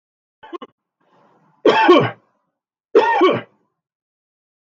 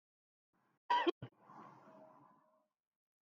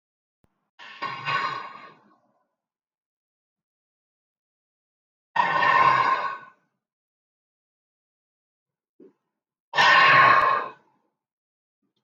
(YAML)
three_cough_length: 4.6 s
three_cough_amplitude: 32768
three_cough_signal_mean_std_ratio: 0.36
cough_length: 3.2 s
cough_amplitude: 2582
cough_signal_mean_std_ratio: 0.25
exhalation_length: 12.0 s
exhalation_amplitude: 19464
exhalation_signal_mean_std_ratio: 0.35
survey_phase: beta (2021-08-13 to 2022-03-07)
age: 65+
gender: Male
wearing_mask: 'No'
symptom_none: true
smoker_status: Ex-smoker
respiratory_condition_asthma: false
respiratory_condition_other: false
recruitment_source: REACT
submission_delay: 1 day
covid_test_result: Negative
covid_test_method: RT-qPCR
influenza_a_test_result: Unknown/Void
influenza_b_test_result: Unknown/Void